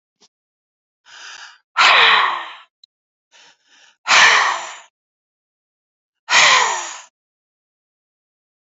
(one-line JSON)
{"exhalation_length": "8.6 s", "exhalation_amplitude": 31798, "exhalation_signal_mean_std_ratio": 0.37, "survey_phase": "beta (2021-08-13 to 2022-03-07)", "age": "45-64", "gender": "Female", "wearing_mask": "No", "symptom_none": true, "smoker_status": "Ex-smoker", "respiratory_condition_asthma": false, "respiratory_condition_other": false, "recruitment_source": "REACT", "submission_delay": "1 day", "covid_test_result": "Negative", "covid_test_method": "RT-qPCR", "influenza_a_test_result": "Unknown/Void", "influenza_b_test_result": "Unknown/Void"}